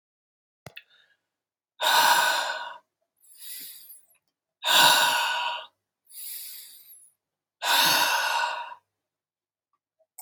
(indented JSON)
{
  "exhalation_length": "10.2 s",
  "exhalation_amplitude": 16946,
  "exhalation_signal_mean_std_ratio": 0.44,
  "survey_phase": "beta (2021-08-13 to 2022-03-07)",
  "age": "18-44",
  "gender": "Male",
  "wearing_mask": "No",
  "symptom_cough_any": true,
  "symptom_runny_or_blocked_nose": true,
  "symptom_sore_throat": true,
  "symptom_diarrhoea": true,
  "symptom_fatigue": true,
  "symptom_fever_high_temperature": true,
  "symptom_headache": true,
  "symptom_change_to_sense_of_smell_or_taste": true,
  "symptom_loss_of_taste": true,
  "smoker_status": "Never smoked",
  "respiratory_condition_asthma": false,
  "respiratory_condition_other": false,
  "recruitment_source": "Test and Trace",
  "submission_delay": "2 days",
  "covid_test_result": "Positive",
  "covid_test_method": "RT-qPCR",
  "covid_ct_value": 27.0,
  "covid_ct_gene": "ORF1ab gene",
  "covid_ct_mean": 27.6,
  "covid_viral_load": "890 copies/ml",
  "covid_viral_load_category": "Minimal viral load (< 10K copies/ml)"
}